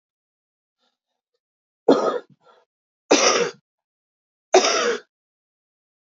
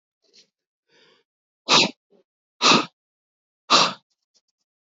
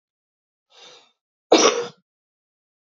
{"three_cough_length": "6.1 s", "three_cough_amplitude": 27830, "three_cough_signal_mean_std_ratio": 0.32, "exhalation_length": "4.9 s", "exhalation_amplitude": 28813, "exhalation_signal_mean_std_ratio": 0.28, "cough_length": "2.8 s", "cough_amplitude": 28103, "cough_signal_mean_std_ratio": 0.25, "survey_phase": "beta (2021-08-13 to 2022-03-07)", "age": "18-44", "gender": "Female", "wearing_mask": "No", "symptom_cough_any": true, "symptom_onset": "12 days", "smoker_status": "Ex-smoker", "respiratory_condition_asthma": false, "respiratory_condition_other": false, "recruitment_source": "REACT", "submission_delay": "1 day", "covid_test_result": "Negative", "covid_test_method": "RT-qPCR", "influenza_a_test_result": "Negative", "influenza_b_test_result": "Negative"}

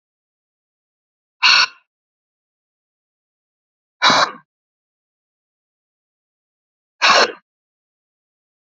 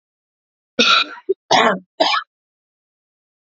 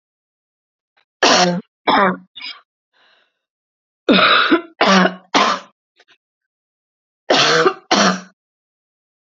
{"exhalation_length": "8.7 s", "exhalation_amplitude": 31644, "exhalation_signal_mean_std_ratio": 0.24, "cough_length": "3.5 s", "cough_amplitude": 31930, "cough_signal_mean_std_ratio": 0.38, "three_cough_length": "9.3 s", "three_cough_amplitude": 32144, "three_cough_signal_mean_std_ratio": 0.43, "survey_phase": "beta (2021-08-13 to 2022-03-07)", "age": "45-64", "gender": "Female", "wearing_mask": "No", "symptom_cough_any": true, "symptom_fatigue": true, "symptom_headache": true, "smoker_status": "Ex-smoker", "respiratory_condition_asthma": true, "respiratory_condition_other": false, "recruitment_source": "Test and Trace", "submission_delay": "2 days", "covid_test_result": "Positive", "covid_test_method": "RT-qPCR", "covid_ct_value": 29.1, "covid_ct_gene": "N gene"}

